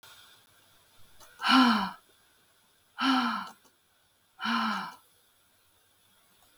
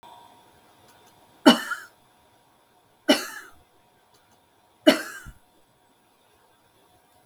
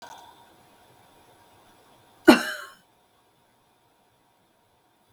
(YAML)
exhalation_length: 6.6 s
exhalation_amplitude: 11820
exhalation_signal_mean_std_ratio: 0.37
three_cough_length: 7.3 s
three_cough_amplitude: 32766
three_cough_signal_mean_std_ratio: 0.2
cough_length: 5.1 s
cough_amplitude: 32766
cough_signal_mean_std_ratio: 0.15
survey_phase: beta (2021-08-13 to 2022-03-07)
age: 65+
gender: Female
wearing_mask: 'No'
symptom_runny_or_blocked_nose: true
symptom_sore_throat: true
symptom_diarrhoea: true
symptom_onset: 12 days
smoker_status: Never smoked
respiratory_condition_asthma: false
respiratory_condition_other: false
recruitment_source: REACT
submission_delay: 2 days
covid_test_result: Negative
covid_test_method: RT-qPCR
influenza_a_test_result: Negative
influenza_b_test_result: Negative